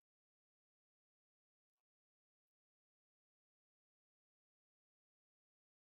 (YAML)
exhalation_length: 5.9 s
exhalation_amplitude: 1
exhalation_signal_mean_std_ratio: 0.03
survey_phase: beta (2021-08-13 to 2022-03-07)
age: 65+
gender: Female
wearing_mask: 'No'
symptom_cough_any: true
symptom_shortness_of_breath: true
symptom_fatigue: true
symptom_headache: true
symptom_onset: 12 days
smoker_status: Never smoked
respiratory_condition_asthma: false
respiratory_condition_other: true
recruitment_source: REACT
submission_delay: 1 day
covid_test_result: Negative
covid_test_method: RT-qPCR